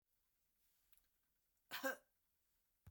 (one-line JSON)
{"cough_length": "2.9 s", "cough_amplitude": 1007, "cough_signal_mean_std_ratio": 0.24, "survey_phase": "beta (2021-08-13 to 2022-03-07)", "age": "65+", "gender": "Female", "wearing_mask": "No", "symptom_none": true, "smoker_status": "Never smoked", "respiratory_condition_asthma": false, "respiratory_condition_other": false, "recruitment_source": "REACT", "submission_delay": "8 days", "covid_test_result": "Negative", "covid_test_method": "RT-qPCR"}